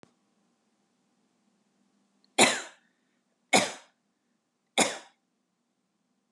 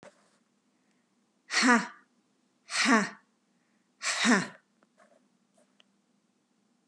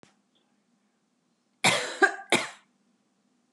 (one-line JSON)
{"three_cough_length": "6.3 s", "three_cough_amplitude": 18768, "three_cough_signal_mean_std_ratio": 0.21, "exhalation_length": "6.9 s", "exhalation_amplitude": 13542, "exhalation_signal_mean_std_ratio": 0.31, "cough_length": "3.5 s", "cough_amplitude": 15574, "cough_signal_mean_std_ratio": 0.28, "survey_phase": "beta (2021-08-13 to 2022-03-07)", "age": "65+", "gender": "Female", "wearing_mask": "No", "symptom_none": true, "smoker_status": "Never smoked", "respiratory_condition_asthma": false, "respiratory_condition_other": false, "recruitment_source": "REACT", "submission_delay": "1 day", "covid_test_result": "Negative", "covid_test_method": "RT-qPCR"}